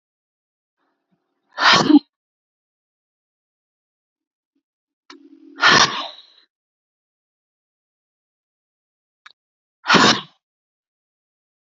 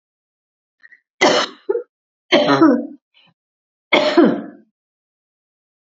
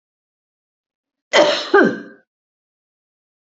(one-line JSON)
{"exhalation_length": "11.7 s", "exhalation_amplitude": 32141, "exhalation_signal_mean_std_ratio": 0.23, "three_cough_length": "5.9 s", "three_cough_amplitude": 29956, "three_cough_signal_mean_std_ratio": 0.38, "cough_length": "3.6 s", "cough_amplitude": 30594, "cough_signal_mean_std_ratio": 0.3, "survey_phase": "beta (2021-08-13 to 2022-03-07)", "age": "45-64", "gender": "Female", "wearing_mask": "No", "symptom_none": true, "smoker_status": "Never smoked", "respiratory_condition_asthma": false, "respiratory_condition_other": false, "recruitment_source": "REACT", "submission_delay": "2 days", "covid_test_result": "Negative", "covid_test_method": "RT-qPCR", "influenza_a_test_result": "Negative", "influenza_b_test_result": "Negative"}